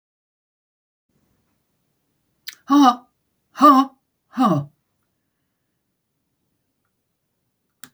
exhalation_length: 7.9 s
exhalation_amplitude: 27685
exhalation_signal_mean_std_ratio: 0.25
survey_phase: alpha (2021-03-01 to 2021-08-12)
age: 65+
gender: Female
wearing_mask: 'No'
symptom_none: true
smoker_status: Never smoked
respiratory_condition_asthma: false
respiratory_condition_other: false
recruitment_source: REACT
submission_delay: 1 day
covid_test_result: Negative
covid_test_method: RT-qPCR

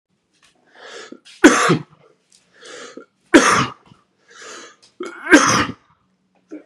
three_cough_length: 6.7 s
three_cough_amplitude: 32768
three_cough_signal_mean_std_ratio: 0.33
survey_phase: beta (2021-08-13 to 2022-03-07)
age: 18-44
gender: Female
wearing_mask: 'No'
symptom_cough_any: true
symptom_runny_or_blocked_nose: true
symptom_fatigue: true
symptom_headache: true
symptom_onset: 3 days
smoker_status: Never smoked
respiratory_condition_asthma: false
respiratory_condition_other: false
recruitment_source: Test and Trace
submission_delay: 2 days
covid_test_result: Positive
covid_test_method: RT-qPCR
covid_ct_value: 28.0
covid_ct_gene: ORF1ab gene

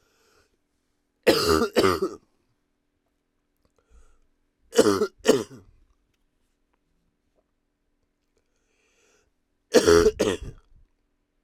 three_cough_length: 11.4 s
three_cough_amplitude: 22422
three_cough_signal_mean_std_ratio: 0.29
survey_phase: alpha (2021-03-01 to 2021-08-12)
age: 18-44
gender: Male
wearing_mask: 'No'
symptom_cough_any: true
symptom_new_continuous_cough: true
symptom_shortness_of_breath: true
symptom_fatigue: true
symptom_fever_high_temperature: true
symptom_headache: true
symptom_change_to_sense_of_smell_or_taste: true
symptom_onset: 4 days
smoker_status: Current smoker (1 to 10 cigarettes per day)
respiratory_condition_asthma: false
respiratory_condition_other: false
recruitment_source: Test and Trace
submission_delay: 2 days
covid_test_result: Positive
covid_test_method: RT-qPCR
covid_ct_value: 18.7
covid_ct_gene: ORF1ab gene
covid_ct_mean: 19.2
covid_viral_load: 500000 copies/ml
covid_viral_load_category: Low viral load (10K-1M copies/ml)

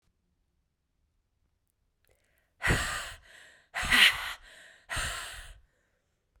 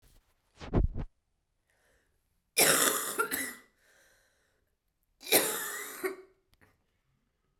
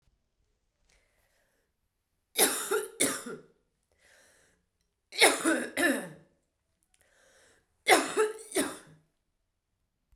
exhalation_length: 6.4 s
exhalation_amplitude: 15533
exhalation_signal_mean_std_ratio: 0.32
cough_length: 7.6 s
cough_amplitude: 12914
cough_signal_mean_std_ratio: 0.37
three_cough_length: 10.2 s
three_cough_amplitude: 18089
three_cough_signal_mean_std_ratio: 0.33
survey_phase: beta (2021-08-13 to 2022-03-07)
age: 18-44
gender: Female
wearing_mask: 'Yes'
symptom_cough_any: true
symptom_runny_or_blocked_nose: true
symptom_shortness_of_breath: true
symptom_fatigue: true
symptom_headache: true
symptom_change_to_sense_of_smell_or_taste: true
symptom_loss_of_taste: true
symptom_other: true
symptom_onset: 5 days
smoker_status: Never smoked
respiratory_condition_asthma: false
respiratory_condition_other: false
recruitment_source: Test and Trace
submission_delay: 2 days
covid_test_result: Positive
covid_test_method: RT-qPCR
covid_ct_value: 19.4
covid_ct_gene: N gene
covid_ct_mean: 20.2
covid_viral_load: 240000 copies/ml
covid_viral_load_category: Low viral load (10K-1M copies/ml)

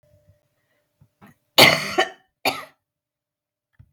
cough_length: 3.9 s
cough_amplitude: 32768
cough_signal_mean_std_ratio: 0.25
survey_phase: beta (2021-08-13 to 2022-03-07)
age: 45-64
gender: Female
wearing_mask: 'No'
symptom_cough_any: true
symptom_new_continuous_cough: true
symptom_runny_or_blocked_nose: true
symptom_fatigue: true
symptom_onset: 2 days
smoker_status: Never smoked
respiratory_condition_asthma: false
respiratory_condition_other: false
recruitment_source: Test and Trace
submission_delay: 0 days
covid_test_result: Positive
covid_test_method: ePCR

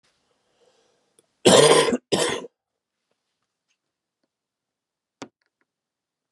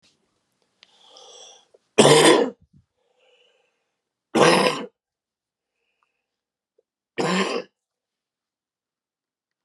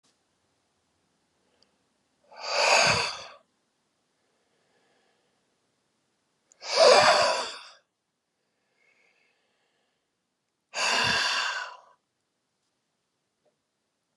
cough_length: 6.3 s
cough_amplitude: 31735
cough_signal_mean_std_ratio: 0.26
three_cough_length: 9.6 s
three_cough_amplitude: 31902
three_cough_signal_mean_std_ratio: 0.28
exhalation_length: 14.2 s
exhalation_amplitude: 18493
exhalation_signal_mean_std_ratio: 0.31
survey_phase: beta (2021-08-13 to 2022-03-07)
age: 18-44
gender: Male
wearing_mask: 'No'
symptom_cough_any: true
symptom_shortness_of_breath: true
symptom_fatigue: true
smoker_status: Ex-smoker
respiratory_condition_asthma: true
respiratory_condition_other: false
recruitment_source: Test and Trace
submission_delay: 1 day
covid_test_result: Positive
covid_test_method: RT-qPCR
covid_ct_value: 21.4
covid_ct_gene: S gene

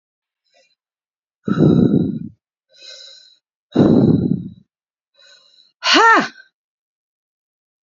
exhalation_length: 7.9 s
exhalation_amplitude: 32767
exhalation_signal_mean_std_ratio: 0.39
survey_phase: beta (2021-08-13 to 2022-03-07)
age: 45-64
gender: Female
wearing_mask: 'No'
symptom_none: true
smoker_status: Current smoker (e-cigarettes or vapes only)
respiratory_condition_asthma: false
respiratory_condition_other: false
recruitment_source: REACT
submission_delay: 4 days
covid_test_result: Negative
covid_test_method: RT-qPCR
influenza_a_test_result: Negative
influenza_b_test_result: Negative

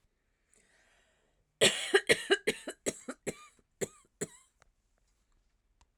cough_length: 6.0 s
cough_amplitude: 9978
cough_signal_mean_std_ratio: 0.26
survey_phase: alpha (2021-03-01 to 2021-08-12)
age: 45-64
gender: Female
wearing_mask: 'No'
symptom_none: true
smoker_status: Ex-smoker
respiratory_condition_asthma: false
respiratory_condition_other: false
recruitment_source: REACT
submission_delay: 4 days
covid_test_method: RT-qPCR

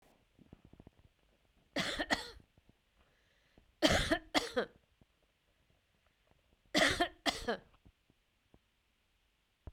three_cough_length: 9.7 s
three_cough_amplitude: 7427
three_cough_signal_mean_std_ratio: 0.3
survey_phase: beta (2021-08-13 to 2022-03-07)
age: 45-64
gender: Female
wearing_mask: 'No'
symptom_none: true
smoker_status: Never smoked
respiratory_condition_asthma: false
respiratory_condition_other: false
recruitment_source: REACT
submission_delay: 1 day
covid_test_result: Negative
covid_test_method: RT-qPCR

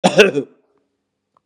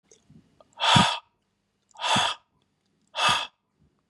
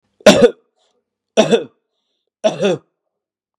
cough_length: 1.5 s
cough_amplitude: 32768
cough_signal_mean_std_ratio: 0.35
exhalation_length: 4.1 s
exhalation_amplitude: 19432
exhalation_signal_mean_std_ratio: 0.38
three_cough_length: 3.6 s
three_cough_amplitude: 32768
three_cough_signal_mean_std_ratio: 0.34
survey_phase: beta (2021-08-13 to 2022-03-07)
age: 45-64
gender: Male
wearing_mask: 'No'
symptom_fatigue: true
smoker_status: Ex-smoker
respiratory_condition_asthma: false
respiratory_condition_other: false
recruitment_source: REACT
submission_delay: 0 days
covid_test_result: Negative
covid_test_method: RT-qPCR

